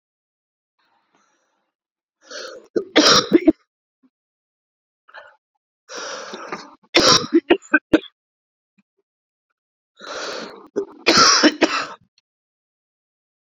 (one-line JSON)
{"three_cough_length": "13.6 s", "three_cough_amplitude": 32768, "three_cough_signal_mean_std_ratio": 0.31, "survey_phase": "beta (2021-08-13 to 2022-03-07)", "age": "45-64", "gender": "Male", "wearing_mask": "No", "symptom_cough_any": true, "symptom_runny_or_blocked_nose": true, "symptom_sore_throat": true, "symptom_fatigue": true, "symptom_fever_high_temperature": true, "symptom_change_to_sense_of_smell_or_taste": true, "symptom_loss_of_taste": true, "symptom_onset": "3 days", "smoker_status": "Never smoked", "respiratory_condition_asthma": false, "respiratory_condition_other": false, "recruitment_source": "Test and Trace", "submission_delay": "2 days", "covid_test_result": "Positive", "covid_test_method": "RT-qPCR", "covid_ct_value": 19.7, "covid_ct_gene": "ORF1ab gene"}